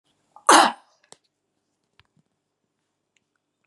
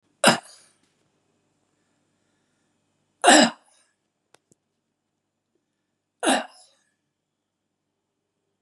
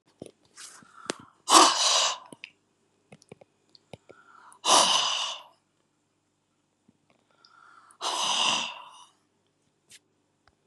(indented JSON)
{
  "cough_length": "3.7 s",
  "cough_amplitude": 30607,
  "cough_signal_mean_std_ratio": 0.19,
  "three_cough_length": "8.6 s",
  "three_cough_amplitude": 30524,
  "three_cough_signal_mean_std_ratio": 0.2,
  "exhalation_length": "10.7 s",
  "exhalation_amplitude": 26328,
  "exhalation_signal_mean_std_ratio": 0.33,
  "survey_phase": "beta (2021-08-13 to 2022-03-07)",
  "age": "65+",
  "gender": "Female",
  "wearing_mask": "No",
  "symptom_none": true,
  "smoker_status": "Ex-smoker",
  "respiratory_condition_asthma": false,
  "respiratory_condition_other": false,
  "recruitment_source": "REACT",
  "submission_delay": "2 days",
  "covid_test_result": "Negative",
  "covid_test_method": "RT-qPCR",
  "influenza_a_test_result": "Negative",
  "influenza_b_test_result": "Negative"
}